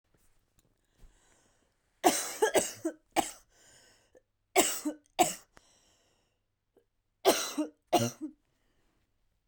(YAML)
three_cough_length: 9.5 s
three_cough_amplitude: 11955
three_cough_signal_mean_std_ratio: 0.31
survey_phase: beta (2021-08-13 to 2022-03-07)
age: 18-44
gender: Female
wearing_mask: 'No'
symptom_cough_any: true
symptom_runny_or_blocked_nose: true
symptom_shortness_of_breath: true
symptom_sore_throat: true
symptom_fatigue: true
symptom_onset: 3 days
smoker_status: Ex-smoker
respiratory_condition_asthma: false
respiratory_condition_other: false
recruitment_source: Test and Trace
submission_delay: 1 day
covid_test_result: Positive
covid_test_method: RT-qPCR
covid_ct_value: 19.8
covid_ct_gene: ORF1ab gene
covid_ct_mean: 20.1
covid_viral_load: 250000 copies/ml
covid_viral_load_category: Low viral load (10K-1M copies/ml)